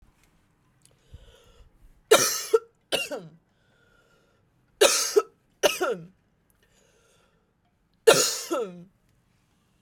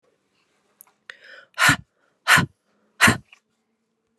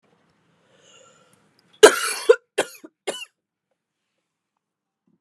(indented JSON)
{
  "three_cough_length": "9.8 s",
  "three_cough_amplitude": 26139,
  "three_cough_signal_mean_std_ratio": 0.3,
  "exhalation_length": "4.2 s",
  "exhalation_amplitude": 30341,
  "exhalation_signal_mean_std_ratio": 0.27,
  "cough_length": "5.2 s",
  "cough_amplitude": 32768,
  "cough_signal_mean_std_ratio": 0.18,
  "survey_phase": "beta (2021-08-13 to 2022-03-07)",
  "age": "18-44",
  "gender": "Female",
  "wearing_mask": "No",
  "symptom_cough_any": true,
  "symptom_runny_or_blocked_nose": true,
  "symptom_shortness_of_breath": true,
  "symptom_sore_throat": true,
  "symptom_change_to_sense_of_smell_or_taste": true,
  "smoker_status": "Never smoked",
  "respiratory_condition_asthma": false,
  "respiratory_condition_other": false,
  "recruitment_source": "Test and Trace",
  "submission_delay": "3 days",
  "covid_test_result": "Positive",
  "covid_test_method": "RT-qPCR",
  "covid_ct_value": 11.5,
  "covid_ct_gene": "ORF1ab gene",
  "covid_ct_mean": 12.0,
  "covid_viral_load": "110000000 copies/ml",
  "covid_viral_load_category": "High viral load (>1M copies/ml)"
}